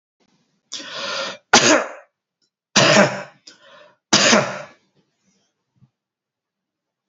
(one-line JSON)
{"three_cough_length": "7.1 s", "three_cough_amplitude": 32768, "three_cough_signal_mean_std_ratio": 0.35, "survey_phase": "beta (2021-08-13 to 2022-03-07)", "age": "45-64", "gender": "Male", "wearing_mask": "No", "symptom_cough_any": true, "symptom_runny_or_blocked_nose": true, "symptom_onset": "3 days", "smoker_status": "Never smoked", "respiratory_condition_asthma": false, "respiratory_condition_other": false, "recruitment_source": "Test and Trace", "submission_delay": "2 days", "covid_test_result": "Positive", "covid_test_method": "RT-qPCR", "covid_ct_value": 16.2, "covid_ct_gene": "ORF1ab gene", "covid_ct_mean": 16.4, "covid_viral_load": "4100000 copies/ml", "covid_viral_load_category": "High viral load (>1M copies/ml)"}